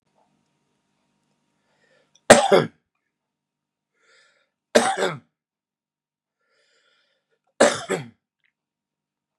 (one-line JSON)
{"three_cough_length": "9.4 s", "three_cough_amplitude": 32768, "three_cough_signal_mean_std_ratio": 0.21, "survey_phase": "beta (2021-08-13 to 2022-03-07)", "age": "45-64", "gender": "Male", "wearing_mask": "No", "symptom_cough_any": true, "symptom_sore_throat": true, "symptom_headache": true, "symptom_onset": "6 days", "smoker_status": "Never smoked", "respiratory_condition_asthma": false, "respiratory_condition_other": false, "recruitment_source": "Test and Trace", "submission_delay": "2 days", "covid_test_result": "Negative", "covid_test_method": "RT-qPCR"}